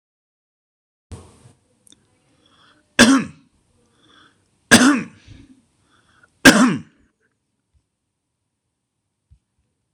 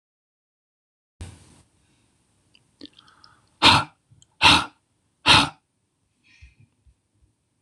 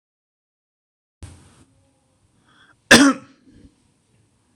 three_cough_length: 9.9 s
three_cough_amplitude: 26028
three_cough_signal_mean_std_ratio: 0.23
exhalation_length: 7.6 s
exhalation_amplitude: 26028
exhalation_signal_mean_std_ratio: 0.23
cough_length: 4.6 s
cough_amplitude: 26028
cough_signal_mean_std_ratio: 0.19
survey_phase: beta (2021-08-13 to 2022-03-07)
age: 65+
gender: Male
wearing_mask: 'No'
symptom_none: true
smoker_status: Ex-smoker
respiratory_condition_asthma: false
respiratory_condition_other: false
recruitment_source: REACT
submission_delay: 0 days
covid_test_result: Negative
covid_test_method: RT-qPCR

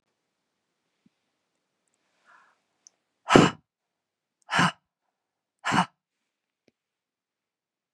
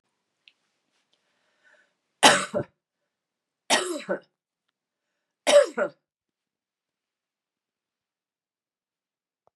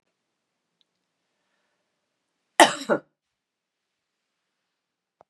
exhalation_length: 7.9 s
exhalation_amplitude: 32767
exhalation_signal_mean_std_ratio: 0.19
three_cough_length: 9.6 s
three_cough_amplitude: 28639
three_cough_signal_mean_std_ratio: 0.22
cough_length: 5.3 s
cough_amplitude: 32768
cough_signal_mean_std_ratio: 0.14
survey_phase: beta (2021-08-13 to 2022-03-07)
age: 45-64
gender: Female
wearing_mask: 'No'
symptom_runny_or_blocked_nose: true
symptom_fatigue: true
symptom_change_to_sense_of_smell_or_taste: true
symptom_loss_of_taste: true
smoker_status: Never smoked
respiratory_condition_asthma: false
respiratory_condition_other: false
recruitment_source: Test and Trace
submission_delay: 3 days
covid_test_result: Positive
covid_test_method: RT-qPCR
covid_ct_value: 19.9
covid_ct_gene: N gene
covid_ct_mean: 21.0
covid_viral_load: 130000 copies/ml
covid_viral_load_category: Low viral load (10K-1M copies/ml)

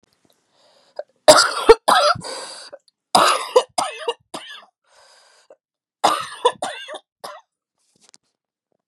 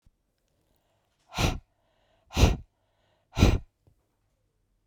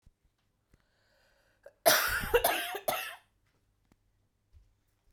three_cough_length: 8.9 s
three_cough_amplitude: 32768
three_cough_signal_mean_std_ratio: 0.32
exhalation_length: 4.9 s
exhalation_amplitude: 17770
exhalation_signal_mean_std_ratio: 0.26
cough_length: 5.1 s
cough_amplitude: 11154
cough_signal_mean_std_ratio: 0.33
survey_phase: beta (2021-08-13 to 2022-03-07)
age: 18-44
gender: Female
wearing_mask: 'No'
symptom_cough_any: true
symptom_runny_or_blocked_nose: true
symptom_fatigue: true
symptom_change_to_sense_of_smell_or_taste: true
symptom_loss_of_taste: true
symptom_onset: 5 days
smoker_status: Ex-smoker
respiratory_condition_asthma: false
respiratory_condition_other: false
recruitment_source: Test and Trace
submission_delay: 2 days
covid_test_result: Positive
covid_test_method: RT-qPCR
covid_ct_value: 15.3
covid_ct_gene: ORF1ab gene
covid_ct_mean: 15.6
covid_viral_load: 7800000 copies/ml
covid_viral_load_category: High viral load (>1M copies/ml)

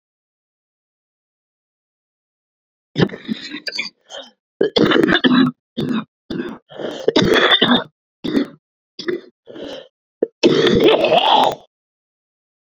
cough_length: 12.8 s
cough_amplitude: 32768
cough_signal_mean_std_ratio: 0.45
survey_phase: beta (2021-08-13 to 2022-03-07)
age: 45-64
gender: Female
wearing_mask: 'No'
symptom_cough_any: true
symptom_runny_or_blocked_nose: true
symptom_sore_throat: true
symptom_fatigue: true
symptom_fever_high_temperature: true
symptom_headache: true
symptom_change_to_sense_of_smell_or_taste: true
symptom_onset: 2 days
smoker_status: Ex-smoker
respiratory_condition_asthma: true
respiratory_condition_other: true
recruitment_source: Test and Trace
submission_delay: 2 days
covid_test_result: Positive
covid_test_method: RT-qPCR
covid_ct_value: 13.1
covid_ct_gene: ORF1ab gene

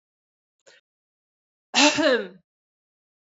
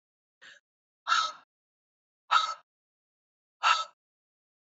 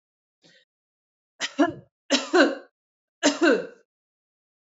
cough_length: 3.2 s
cough_amplitude: 27136
cough_signal_mean_std_ratio: 0.3
exhalation_length: 4.8 s
exhalation_amplitude: 10626
exhalation_signal_mean_std_ratio: 0.28
three_cough_length: 4.6 s
three_cough_amplitude: 22092
three_cough_signal_mean_std_ratio: 0.34
survey_phase: beta (2021-08-13 to 2022-03-07)
age: 45-64
gender: Female
wearing_mask: 'No'
symptom_none: true
smoker_status: Never smoked
respiratory_condition_asthma: false
respiratory_condition_other: false
recruitment_source: REACT
submission_delay: 1 day
covid_test_result: Negative
covid_test_method: RT-qPCR
influenza_a_test_result: Negative
influenza_b_test_result: Negative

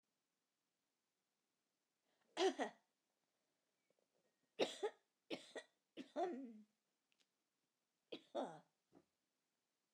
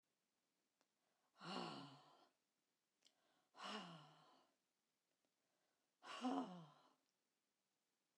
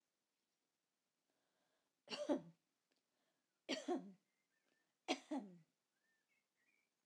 cough_length: 9.9 s
cough_amplitude: 2180
cough_signal_mean_std_ratio: 0.27
exhalation_length: 8.2 s
exhalation_amplitude: 792
exhalation_signal_mean_std_ratio: 0.34
three_cough_length: 7.1 s
three_cough_amplitude: 1559
three_cough_signal_mean_std_ratio: 0.27
survey_phase: alpha (2021-03-01 to 2021-08-12)
age: 65+
gender: Female
wearing_mask: 'No'
symptom_none: true
smoker_status: Never smoked
respiratory_condition_asthma: false
respiratory_condition_other: false
recruitment_source: REACT
submission_delay: 1 day
covid_test_result: Negative
covid_test_method: RT-qPCR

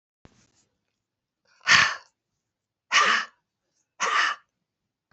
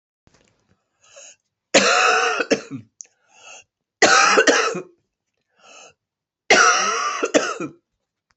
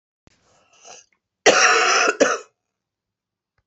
exhalation_length: 5.1 s
exhalation_amplitude: 25700
exhalation_signal_mean_std_ratio: 0.33
three_cough_length: 8.4 s
three_cough_amplitude: 30691
three_cough_signal_mean_std_ratio: 0.44
cough_length: 3.7 s
cough_amplitude: 28038
cough_signal_mean_std_ratio: 0.39
survey_phase: beta (2021-08-13 to 2022-03-07)
age: 65+
gender: Female
wearing_mask: 'No'
symptom_cough_any: true
smoker_status: Ex-smoker
respiratory_condition_asthma: false
respiratory_condition_other: true
recruitment_source: Test and Trace
submission_delay: 2 days
covid_test_result: Positive
covid_test_method: RT-qPCR
covid_ct_value: 28.5
covid_ct_gene: N gene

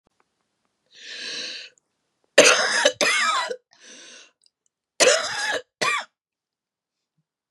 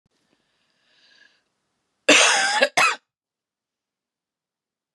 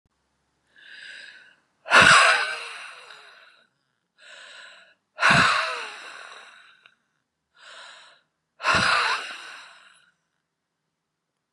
three_cough_length: 7.5 s
three_cough_amplitude: 32768
three_cough_signal_mean_std_ratio: 0.39
cough_length: 4.9 s
cough_amplitude: 30261
cough_signal_mean_std_ratio: 0.3
exhalation_length: 11.5 s
exhalation_amplitude: 26777
exhalation_signal_mean_std_ratio: 0.34
survey_phase: beta (2021-08-13 to 2022-03-07)
age: 45-64
gender: Female
wearing_mask: 'No'
symptom_cough_any: true
symptom_onset: 2 days
smoker_status: Ex-smoker
respiratory_condition_asthma: false
respiratory_condition_other: false
recruitment_source: Test and Trace
submission_delay: 1 day
covid_test_result: Negative
covid_test_method: RT-qPCR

